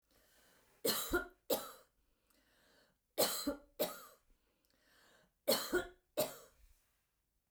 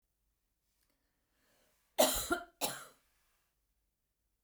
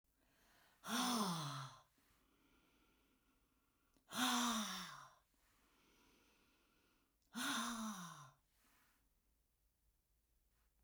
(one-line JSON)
{"three_cough_length": "7.5 s", "three_cough_amplitude": 3565, "three_cough_signal_mean_std_ratio": 0.36, "cough_length": "4.4 s", "cough_amplitude": 5716, "cough_signal_mean_std_ratio": 0.25, "exhalation_length": "10.8 s", "exhalation_amplitude": 1463, "exhalation_signal_mean_std_ratio": 0.4, "survey_phase": "beta (2021-08-13 to 2022-03-07)", "age": "65+", "gender": "Female", "wearing_mask": "No", "symptom_none": true, "smoker_status": "Never smoked", "respiratory_condition_asthma": false, "respiratory_condition_other": false, "recruitment_source": "REACT", "submission_delay": "1 day", "covid_test_result": "Negative", "covid_test_method": "RT-qPCR"}